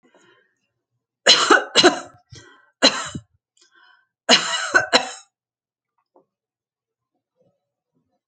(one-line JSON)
{"three_cough_length": "8.3 s", "three_cough_amplitude": 32767, "three_cough_signal_mean_std_ratio": 0.3, "survey_phase": "alpha (2021-03-01 to 2021-08-12)", "age": "65+", "gender": "Female", "wearing_mask": "No", "symptom_none": true, "smoker_status": "Ex-smoker", "respiratory_condition_asthma": false, "respiratory_condition_other": false, "recruitment_source": "REACT", "submission_delay": "1 day", "covid_test_result": "Negative", "covid_test_method": "RT-qPCR"}